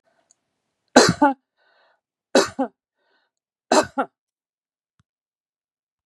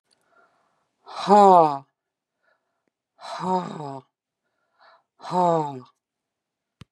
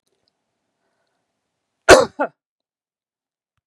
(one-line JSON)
{"three_cough_length": "6.1 s", "three_cough_amplitude": 32768, "three_cough_signal_mean_std_ratio": 0.24, "exhalation_length": "6.9 s", "exhalation_amplitude": 26614, "exhalation_signal_mean_std_ratio": 0.3, "cough_length": "3.7 s", "cough_amplitude": 32768, "cough_signal_mean_std_ratio": 0.17, "survey_phase": "beta (2021-08-13 to 2022-03-07)", "age": "65+", "gender": "Female", "wearing_mask": "No", "symptom_none": true, "smoker_status": "Never smoked", "respiratory_condition_asthma": false, "respiratory_condition_other": false, "recruitment_source": "REACT", "submission_delay": "3 days", "covid_test_result": "Negative", "covid_test_method": "RT-qPCR", "influenza_a_test_result": "Negative", "influenza_b_test_result": "Negative"}